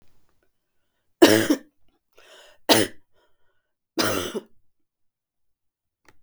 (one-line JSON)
{"three_cough_length": "6.2 s", "three_cough_amplitude": 32766, "three_cough_signal_mean_std_ratio": 0.26, "survey_phase": "beta (2021-08-13 to 2022-03-07)", "age": "65+", "gender": "Female", "wearing_mask": "No", "symptom_runny_or_blocked_nose": true, "smoker_status": "Never smoked", "respiratory_condition_asthma": false, "respiratory_condition_other": false, "recruitment_source": "Test and Trace", "submission_delay": "0 days", "covid_test_result": "Negative", "covid_test_method": "LFT"}